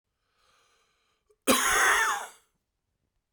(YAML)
cough_length: 3.3 s
cough_amplitude: 14354
cough_signal_mean_std_ratio: 0.4
survey_phase: beta (2021-08-13 to 2022-03-07)
age: 45-64
gender: Male
wearing_mask: 'No'
symptom_none: true
smoker_status: Current smoker (e-cigarettes or vapes only)
respiratory_condition_asthma: true
respiratory_condition_other: false
recruitment_source: REACT
submission_delay: 1 day
covid_test_result: Negative
covid_test_method: RT-qPCR